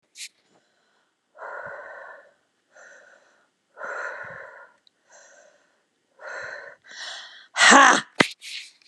{
  "exhalation_length": "8.9 s",
  "exhalation_amplitude": 32399,
  "exhalation_signal_mean_std_ratio": 0.25,
  "survey_phase": "beta (2021-08-13 to 2022-03-07)",
  "age": "45-64",
  "gender": "Female",
  "wearing_mask": "No",
  "symptom_none": true,
  "smoker_status": "Never smoked",
  "respiratory_condition_asthma": false,
  "respiratory_condition_other": false,
  "recruitment_source": "REACT",
  "submission_delay": "2 days",
  "covid_test_result": "Negative",
  "covid_test_method": "RT-qPCR",
  "influenza_a_test_result": "Negative",
  "influenza_b_test_result": "Negative"
}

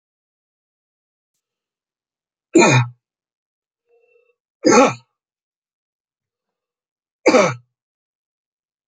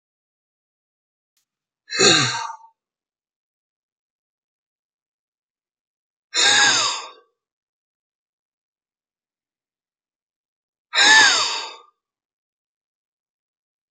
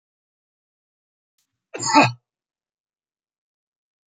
{
  "three_cough_length": "8.9 s",
  "three_cough_amplitude": 30014,
  "three_cough_signal_mean_std_ratio": 0.25,
  "exhalation_length": "13.9 s",
  "exhalation_amplitude": 32768,
  "exhalation_signal_mean_std_ratio": 0.28,
  "cough_length": "4.1 s",
  "cough_amplitude": 26584,
  "cough_signal_mean_std_ratio": 0.19,
  "survey_phase": "beta (2021-08-13 to 2022-03-07)",
  "age": "65+",
  "gender": "Male",
  "wearing_mask": "No",
  "symptom_cough_any": true,
  "symptom_onset": "9 days",
  "smoker_status": "Ex-smoker",
  "respiratory_condition_asthma": true,
  "respiratory_condition_other": false,
  "recruitment_source": "REACT",
  "submission_delay": "2 days",
  "covid_test_result": "Negative",
  "covid_test_method": "RT-qPCR",
  "influenza_a_test_result": "Negative",
  "influenza_b_test_result": "Negative"
}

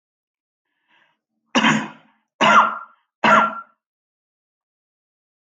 {
  "three_cough_length": "5.5 s",
  "three_cough_amplitude": 26018,
  "three_cough_signal_mean_std_ratio": 0.33,
  "survey_phase": "alpha (2021-03-01 to 2021-08-12)",
  "age": "65+",
  "gender": "Male",
  "wearing_mask": "No",
  "symptom_none": true,
  "smoker_status": "Never smoked",
  "respiratory_condition_asthma": false,
  "respiratory_condition_other": false,
  "recruitment_source": "REACT",
  "submission_delay": "1 day",
  "covid_test_result": "Negative",
  "covid_test_method": "RT-qPCR"
}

